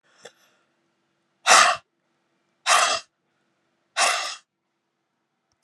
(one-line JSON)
{"exhalation_length": "5.6 s", "exhalation_amplitude": 30764, "exhalation_signal_mean_std_ratio": 0.31, "survey_phase": "alpha (2021-03-01 to 2021-08-12)", "age": "65+", "gender": "Female", "wearing_mask": "No", "symptom_none": true, "smoker_status": "Ex-smoker", "respiratory_condition_asthma": false, "respiratory_condition_other": false, "recruitment_source": "REACT", "submission_delay": "1 day", "covid_test_result": "Negative", "covid_test_method": "RT-qPCR"}